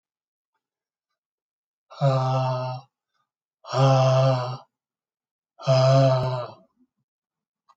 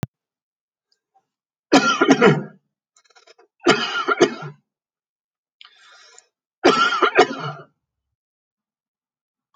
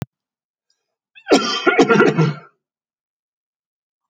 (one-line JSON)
{"exhalation_length": "7.8 s", "exhalation_amplitude": 13696, "exhalation_signal_mean_std_ratio": 0.47, "three_cough_length": "9.6 s", "three_cough_amplitude": 31223, "three_cough_signal_mean_std_ratio": 0.34, "cough_length": "4.1 s", "cough_amplitude": 32023, "cough_signal_mean_std_ratio": 0.37, "survey_phase": "alpha (2021-03-01 to 2021-08-12)", "age": "65+", "gender": "Male", "wearing_mask": "No", "symptom_none": true, "smoker_status": "Never smoked", "respiratory_condition_asthma": true, "respiratory_condition_other": false, "recruitment_source": "REACT", "submission_delay": "2 days", "covid_test_result": "Negative", "covid_test_method": "RT-qPCR"}